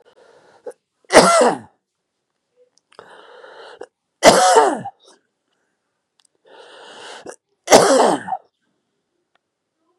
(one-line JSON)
{"three_cough_length": "10.0 s", "three_cough_amplitude": 32768, "three_cough_signal_mean_std_ratio": 0.32, "survey_phase": "beta (2021-08-13 to 2022-03-07)", "age": "65+", "gender": "Male", "wearing_mask": "Yes", "symptom_cough_any": true, "symptom_runny_or_blocked_nose": true, "symptom_fatigue": true, "symptom_headache": true, "symptom_onset": "3 days", "smoker_status": "Never smoked", "respiratory_condition_asthma": false, "respiratory_condition_other": false, "recruitment_source": "Test and Trace", "submission_delay": "0 days", "covid_test_result": "Positive", "covid_test_method": "RT-qPCR", "covid_ct_value": 17.8, "covid_ct_gene": "ORF1ab gene", "covid_ct_mean": 18.0, "covid_viral_load": "1200000 copies/ml", "covid_viral_load_category": "High viral load (>1M copies/ml)"}